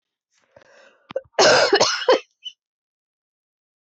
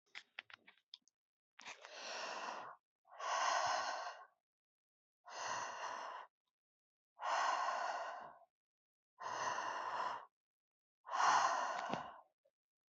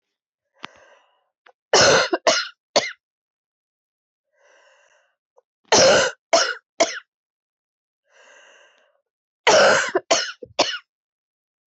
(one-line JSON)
{"cough_length": "3.8 s", "cough_amplitude": 21547, "cough_signal_mean_std_ratio": 0.36, "exhalation_length": "12.9 s", "exhalation_amplitude": 2851, "exhalation_signal_mean_std_ratio": 0.53, "three_cough_length": "11.7 s", "three_cough_amplitude": 23804, "three_cough_signal_mean_std_ratio": 0.34, "survey_phase": "beta (2021-08-13 to 2022-03-07)", "age": "45-64", "gender": "Female", "wearing_mask": "No", "symptom_cough_any": true, "symptom_runny_or_blocked_nose": true, "symptom_shortness_of_breath": true, "symptom_sore_throat": true, "symptom_fatigue": true, "symptom_fever_high_temperature": true, "symptom_headache": true, "symptom_change_to_sense_of_smell_or_taste": true, "symptom_loss_of_taste": true, "symptom_onset": "3 days", "smoker_status": "Never smoked", "respiratory_condition_asthma": false, "respiratory_condition_other": false, "recruitment_source": "Test and Trace", "submission_delay": "1 day", "covid_test_result": "Positive", "covid_test_method": "RT-qPCR", "covid_ct_value": 16.7, "covid_ct_gene": "ORF1ab gene", "covid_ct_mean": 17.0, "covid_viral_load": "2600000 copies/ml", "covid_viral_load_category": "High viral load (>1M copies/ml)"}